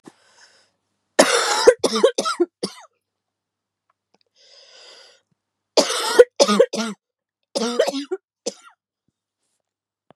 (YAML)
three_cough_length: 10.2 s
three_cough_amplitude: 32768
three_cough_signal_mean_std_ratio: 0.33
survey_phase: beta (2021-08-13 to 2022-03-07)
age: 18-44
gender: Female
wearing_mask: 'No'
symptom_cough_any: true
symptom_new_continuous_cough: true
symptom_runny_or_blocked_nose: true
symptom_sore_throat: true
symptom_fatigue: true
symptom_headache: true
symptom_change_to_sense_of_smell_or_taste: true
symptom_loss_of_taste: true
symptom_other: true
symptom_onset: 8 days
smoker_status: Never smoked
respiratory_condition_asthma: false
respiratory_condition_other: false
recruitment_source: Test and Trace
submission_delay: 2 days
covid_test_result: Positive
covid_test_method: RT-qPCR
covid_ct_value: 17.4
covid_ct_gene: N gene